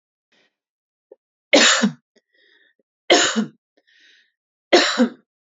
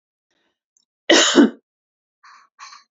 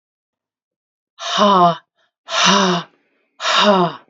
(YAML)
three_cough_length: 5.5 s
three_cough_amplitude: 29588
three_cough_signal_mean_std_ratio: 0.34
cough_length: 2.9 s
cough_amplitude: 31741
cough_signal_mean_std_ratio: 0.3
exhalation_length: 4.1 s
exhalation_amplitude: 31018
exhalation_signal_mean_std_ratio: 0.51
survey_phase: beta (2021-08-13 to 2022-03-07)
age: 45-64
gender: Female
wearing_mask: 'No'
symptom_none: true
smoker_status: Never smoked
respiratory_condition_asthma: false
respiratory_condition_other: false
recruitment_source: REACT
submission_delay: 1 day
covid_test_result: Negative
covid_test_method: RT-qPCR